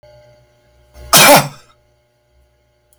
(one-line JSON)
{"cough_length": "3.0 s", "cough_amplitude": 32768, "cough_signal_mean_std_ratio": 0.3, "survey_phase": "beta (2021-08-13 to 2022-03-07)", "age": "45-64", "gender": "Male", "wearing_mask": "No", "symptom_none": true, "smoker_status": "Never smoked", "respiratory_condition_asthma": false, "respiratory_condition_other": false, "recruitment_source": "REACT", "submission_delay": "1 day", "covid_test_result": "Negative", "covid_test_method": "RT-qPCR"}